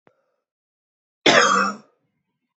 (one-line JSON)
{"cough_length": "2.6 s", "cough_amplitude": 27191, "cough_signal_mean_std_ratio": 0.34, "survey_phase": "beta (2021-08-13 to 2022-03-07)", "age": "18-44", "gender": "Male", "wearing_mask": "No", "symptom_cough_any": true, "symptom_runny_or_blocked_nose": true, "symptom_shortness_of_breath": true, "symptom_sore_throat": true, "smoker_status": "Ex-smoker", "respiratory_condition_asthma": false, "respiratory_condition_other": false, "recruitment_source": "Test and Trace", "submission_delay": "2 days", "covid_test_result": "Positive", "covid_test_method": "RT-qPCR", "covid_ct_value": 32.5, "covid_ct_gene": "N gene"}